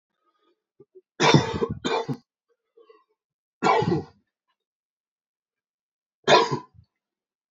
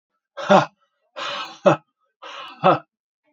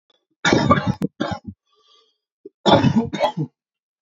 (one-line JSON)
{"three_cough_length": "7.5 s", "three_cough_amplitude": 25240, "three_cough_signal_mean_std_ratio": 0.32, "exhalation_length": "3.3 s", "exhalation_amplitude": 27893, "exhalation_signal_mean_std_ratio": 0.33, "cough_length": "4.0 s", "cough_amplitude": 31384, "cough_signal_mean_std_ratio": 0.45, "survey_phase": "alpha (2021-03-01 to 2021-08-12)", "age": "18-44", "gender": "Male", "wearing_mask": "No", "symptom_cough_any": true, "symptom_fever_high_temperature": true, "symptom_headache": true, "symptom_onset": "5 days", "smoker_status": "Ex-smoker", "respiratory_condition_asthma": false, "respiratory_condition_other": false, "recruitment_source": "Test and Trace", "submission_delay": "2 days", "covid_test_result": "Positive", "covid_test_method": "RT-qPCR", "covid_ct_value": 14.1, "covid_ct_gene": "ORF1ab gene", "covid_ct_mean": 14.3, "covid_viral_load": "21000000 copies/ml", "covid_viral_load_category": "High viral load (>1M copies/ml)"}